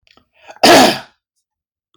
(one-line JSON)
{"cough_length": "2.0 s", "cough_amplitude": 32768, "cough_signal_mean_std_ratio": 0.36, "survey_phase": "beta (2021-08-13 to 2022-03-07)", "age": "45-64", "gender": "Male", "wearing_mask": "No", "symptom_none": true, "smoker_status": "Ex-smoker", "respiratory_condition_asthma": false, "respiratory_condition_other": false, "recruitment_source": "REACT", "submission_delay": "1 day", "covid_test_result": "Negative", "covid_test_method": "RT-qPCR"}